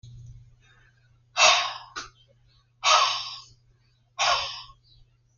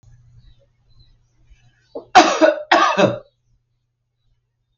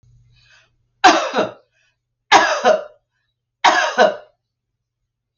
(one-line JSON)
{"exhalation_length": "5.4 s", "exhalation_amplitude": 19995, "exhalation_signal_mean_std_ratio": 0.37, "cough_length": "4.8 s", "cough_amplitude": 31840, "cough_signal_mean_std_ratio": 0.32, "three_cough_length": "5.4 s", "three_cough_amplitude": 32768, "three_cough_signal_mean_std_ratio": 0.38, "survey_phase": "alpha (2021-03-01 to 2021-08-12)", "age": "65+", "gender": "Female", "wearing_mask": "No", "symptom_none": true, "smoker_status": "Ex-smoker", "respiratory_condition_asthma": false, "respiratory_condition_other": false, "recruitment_source": "REACT", "submission_delay": "3 days", "covid_test_result": "Negative", "covid_test_method": "RT-qPCR"}